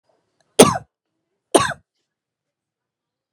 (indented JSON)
{
  "three_cough_length": "3.3 s",
  "three_cough_amplitude": 32768,
  "three_cough_signal_mean_std_ratio": 0.2,
  "survey_phase": "alpha (2021-03-01 to 2021-08-12)",
  "age": "45-64",
  "gender": "Female",
  "wearing_mask": "No",
  "symptom_change_to_sense_of_smell_or_taste": true,
  "symptom_onset": "4 days",
  "smoker_status": "Never smoked",
  "respiratory_condition_asthma": false,
  "respiratory_condition_other": false,
  "recruitment_source": "Test and Trace",
  "submission_delay": "1 day",
  "covid_test_result": "Positive",
  "covid_test_method": "RT-qPCR",
  "covid_ct_value": 20.5,
  "covid_ct_gene": "ORF1ab gene",
  "covid_ct_mean": 22.1,
  "covid_viral_load": "55000 copies/ml",
  "covid_viral_load_category": "Low viral load (10K-1M copies/ml)"
}